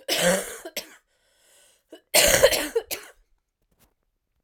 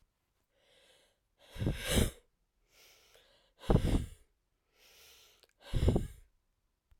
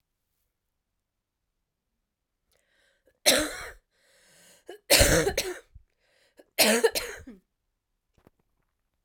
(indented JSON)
{
  "cough_length": "4.4 s",
  "cough_amplitude": 24838,
  "cough_signal_mean_std_ratio": 0.38,
  "exhalation_length": "7.0 s",
  "exhalation_amplitude": 7595,
  "exhalation_signal_mean_std_ratio": 0.32,
  "three_cough_length": "9.0 s",
  "three_cough_amplitude": 19088,
  "three_cough_signal_mean_std_ratio": 0.29,
  "survey_phase": "alpha (2021-03-01 to 2021-08-12)",
  "age": "45-64",
  "gender": "Female",
  "wearing_mask": "No",
  "symptom_cough_any": true,
  "symptom_new_continuous_cough": true,
  "symptom_shortness_of_breath": true,
  "symptom_onset": "6 days",
  "smoker_status": "Never smoked",
  "respiratory_condition_asthma": false,
  "respiratory_condition_other": false,
  "recruitment_source": "Test and Trace",
  "submission_delay": "1 day",
  "covid_test_result": "Positive",
  "covid_test_method": "RT-qPCR",
  "covid_ct_value": 16.5,
  "covid_ct_gene": "ORF1ab gene",
  "covid_ct_mean": 17.1,
  "covid_viral_load": "2500000 copies/ml",
  "covid_viral_load_category": "High viral load (>1M copies/ml)"
}